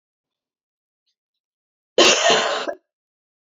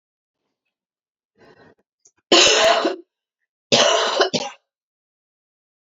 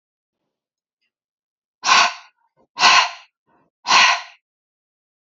{
  "cough_length": "3.4 s",
  "cough_amplitude": 27475,
  "cough_signal_mean_std_ratio": 0.34,
  "three_cough_length": "5.9 s",
  "three_cough_amplitude": 32767,
  "three_cough_signal_mean_std_ratio": 0.37,
  "exhalation_length": "5.4 s",
  "exhalation_amplitude": 32401,
  "exhalation_signal_mean_std_ratio": 0.32,
  "survey_phase": "beta (2021-08-13 to 2022-03-07)",
  "age": "18-44",
  "gender": "Female",
  "wearing_mask": "No",
  "symptom_cough_any": true,
  "symptom_new_continuous_cough": true,
  "symptom_runny_or_blocked_nose": true,
  "symptom_fatigue": true,
  "symptom_headache": true,
  "symptom_change_to_sense_of_smell_or_taste": true,
  "symptom_onset": "4 days",
  "smoker_status": "Never smoked",
  "respiratory_condition_asthma": false,
  "respiratory_condition_other": false,
  "recruitment_source": "Test and Trace",
  "submission_delay": "1 day",
  "covid_test_result": "Positive",
  "covid_test_method": "RT-qPCR",
  "covid_ct_value": 20.9,
  "covid_ct_gene": "ORF1ab gene",
  "covid_ct_mean": 21.8,
  "covid_viral_load": "71000 copies/ml",
  "covid_viral_load_category": "Low viral load (10K-1M copies/ml)"
}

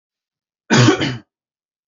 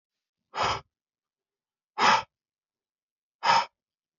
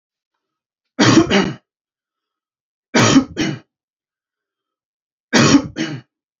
{
  "cough_length": "1.9 s",
  "cough_amplitude": 28108,
  "cough_signal_mean_std_ratio": 0.37,
  "exhalation_length": "4.2 s",
  "exhalation_amplitude": 14006,
  "exhalation_signal_mean_std_ratio": 0.31,
  "three_cough_length": "6.4 s",
  "three_cough_amplitude": 32767,
  "three_cough_signal_mean_std_ratio": 0.37,
  "survey_phase": "beta (2021-08-13 to 2022-03-07)",
  "age": "18-44",
  "gender": "Male",
  "wearing_mask": "No",
  "symptom_none": true,
  "smoker_status": "Never smoked",
  "respiratory_condition_asthma": false,
  "respiratory_condition_other": false,
  "recruitment_source": "REACT",
  "submission_delay": "2 days",
  "covid_test_result": "Negative",
  "covid_test_method": "RT-qPCR",
  "influenza_a_test_result": "Negative",
  "influenza_b_test_result": "Negative"
}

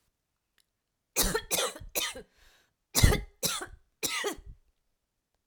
{
  "cough_length": "5.5 s",
  "cough_amplitude": 14490,
  "cough_signal_mean_std_ratio": 0.37,
  "survey_phase": "alpha (2021-03-01 to 2021-08-12)",
  "age": "45-64",
  "gender": "Female",
  "wearing_mask": "No",
  "symptom_none": true,
  "smoker_status": "Ex-smoker",
  "respiratory_condition_asthma": false,
  "respiratory_condition_other": false,
  "recruitment_source": "REACT",
  "submission_delay": "1 day",
  "covid_test_result": "Negative",
  "covid_test_method": "RT-qPCR"
}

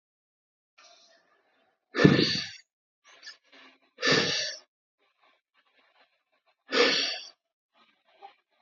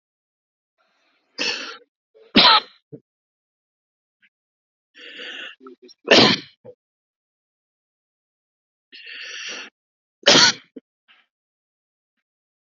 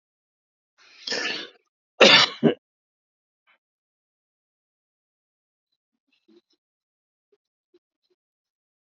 {
  "exhalation_length": "8.6 s",
  "exhalation_amplitude": 27161,
  "exhalation_signal_mean_std_ratio": 0.3,
  "three_cough_length": "12.7 s",
  "three_cough_amplitude": 32609,
  "three_cough_signal_mean_std_ratio": 0.24,
  "cough_length": "8.9 s",
  "cough_amplitude": 28664,
  "cough_signal_mean_std_ratio": 0.19,
  "survey_phase": "alpha (2021-03-01 to 2021-08-12)",
  "age": "65+",
  "gender": "Male",
  "wearing_mask": "Prefer not to say",
  "symptom_none": true,
  "smoker_status": "Ex-smoker",
  "respiratory_condition_asthma": false,
  "respiratory_condition_other": false,
  "recruitment_source": "REACT",
  "submission_delay": "2 days",
  "covid_test_result": "Negative",
  "covid_test_method": "RT-qPCR"
}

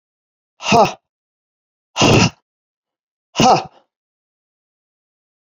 {
  "exhalation_length": "5.5 s",
  "exhalation_amplitude": 30628,
  "exhalation_signal_mean_std_ratio": 0.31,
  "survey_phase": "beta (2021-08-13 to 2022-03-07)",
  "age": "45-64",
  "gender": "Female",
  "wearing_mask": "No",
  "symptom_none": true,
  "smoker_status": "Never smoked",
  "respiratory_condition_asthma": false,
  "respiratory_condition_other": false,
  "recruitment_source": "REACT",
  "submission_delay": "1 day",
  "covid_test_result": "Negative",
  "covid_test_method": "RT-qPCR"
}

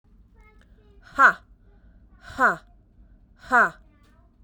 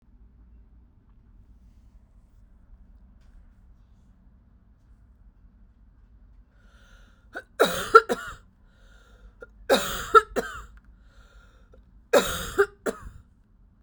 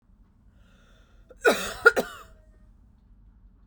{
  "exhalation_length": "4.4 s",
  "exhalation_amplitude": 22338,
  "exhalation_signal_mean_std_ratio": 0.29,
  "three_cough_length": "13.8 s",
  "three_cough_amplitude": 32768,
  "three_cough_signal_mean_std_ratio": 0.24,
  "cough_length": "3.7 s",
  "cough_amplitude": 25463,
  "cough_signal_mean_std_ratio": 0.25,
  "survey_phase": "beta (2021-08-13 to 2022-03-07)",
  "age": "18-44",
  "gender": "Female",
  "wearing_mask": "No",
  "symptom_cough_any": true,
  "symptom_runny_or_blocked_nose": true,
  "symptom_shortness_of_breath": true,
  "symptom_sore_throat": true,
  "symptom_abdominal_pain": true,
  "symptom_fatigue": true,
  "symptom_headache": true,
  "symptom_other": true,
  "symptom_onset": "3 days",
  "smoker_status": "Never smoked",
  "respiratory_condition_asthma": true,
  "respiratory_condition_other": false,
  "recruitment_source": "Test and Trace",
  "submission_delay": "2 days",
  "covid_test_result": "Positive",
  "covid_test_method": "RT-qPCR",
  "covid_ct_value": 22.5,
  "covid_ct_gene": "ORF1ab gene"
}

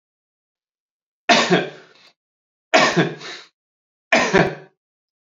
{
  "three_cough_length": "5.2 s",
  "three_cough_amplitude": 30696,
  "three_cough_signal_mean_std_ratio": 0.37,
  "survey_phase": "alpha (2021-03-01 to 2021-08-12)",
  "age": "18-44",
  "gender": "Male",
  "wearing_mask": "No",
  "symptom_new_continuous_cough": true,
  "symptom_fatigue": true,
  "symptom_fever_high_temperature": true,
  "smoker_status": "Never smoked",
  "respiratory_condition_asthma": false,
  "respiratory_condition_other": false,
  "recruitment_source": "Test and Trace",
  "submission_delay": "2 days",
  "covid_test_result": "Positive",
  "covid_test_method": "RT-qPCR",
  "covid_ct_value": 10.7,
  "covid_ct_gene": "ORF1ab gene",
  "covid_ct_mean": 11.0,
  "covid_viral_load": "250000000 copies/ml",
  "covid_viral_load_category": "High viral load (>1M copies/ml)"
}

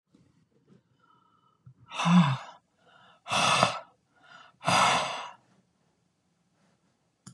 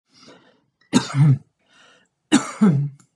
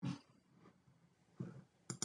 {
  "exhalation_length": "7.3 s",
  "exhalation_amplitude": 19935,
  "exhalation_signal_mean_std_ratio": 0.36,
  "three_cough_length": "3.2 s",
  "three_cough_amplitude": 24262,
  "three_cough_signal_mean_std_ratio": 0.42,
  "cough_length": "2.0 s",
  "cough_amplitude": 2009,
  "cough_signal_mean_std_ratio": 0.39,
  "survey_phase": "beta (2021-08-13 to 2022-03-07)",
  "age": "65+",
  "gender": "Female",
  "wearing_mask": "No",
  "symptom_none": true,
  "smoker_status": "Ex-smoker",
  "respiratory_condition_asthma": false,
  "respiratory_condition_other": false,
  "recruitment_source": "REACT",
  "submission_delay": "10 days",
  "covid_test_result": "Negative",
  "covid_test_method": "RT-qPCR"
}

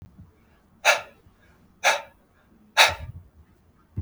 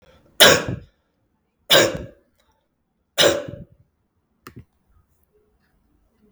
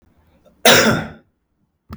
{
  "exhalation_length": "4.0 s",
  "exhalation_amplitude": 30144,
  "exhalation_signal_mean_std_ratio": 0.29,
  "three_cough_length": "6.3 s",
  "three_cough_amplitude": 32768,
  "three_cough_signal_mean_std_ratio": 0.27,
  "cough_length": "2.0 s",
  "cough_amplitude": 32768,
  "cough_signal_mean_std_ratio": 0.36,
  "survey_phase": "beta (2021-08-13 to 2022-03-07)",
  "age": "18-44",
  "gender": "Male",
  "wearing_mask": "No",
  "symptom_runny_or_blocked_nose": true,
  "smoker_status": "Never smoked",
  "respiratory_condition_asthma": false,
  "respiratory_condition_other": false,
  "recruitment_source": "REACT",
  "submission_delay": "1 day",
  "covid_test_result": "Negative",
  "covid_test_method": "RT-qPCR"
}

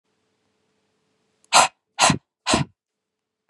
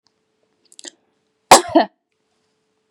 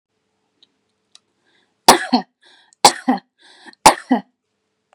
{
  "exhalation_length": "3.5 s",
  "exhalation_amplitude": 31851,
  "exhalation_signal_mean_std_ratio": 0.28,
  "cough_length": "2.9 s",
  "cough_amplitude": 32768,
  "cough_signal_mean_std_ratio": 0.2,
  "three_cough_length": "4.9 s",
  "three_cough_amplitude": 32768,
  "three_cough_signal_mean_std_ratio": 0.24,
  "survey_phase": "beta (2021-08-13 to 2022-03-07)",
  "age": "18-44",
  "gender": "Female",
  "wearing_mask": "No",
  "symptom_sore_throat": true,
  "symptom_diarrhoea": true,
  "symptom_fatigue": true,
  "symptom_headache": true,
  "symptom_onset": "13 days",
  "smoker_status": "Ex-smoker",
  "respiratory_condition_asthma": false,
  "respiratory_condition_other": false,
  "recruitment_source": "REACT",
  "submission_delay": "1 day",
  "covid_test_result": "Negative",
  "covid_test_method": "RT-qPCR",
  "influenza_a_test_result": "Negative",
  "influenza_b_test_result": "Negative"
}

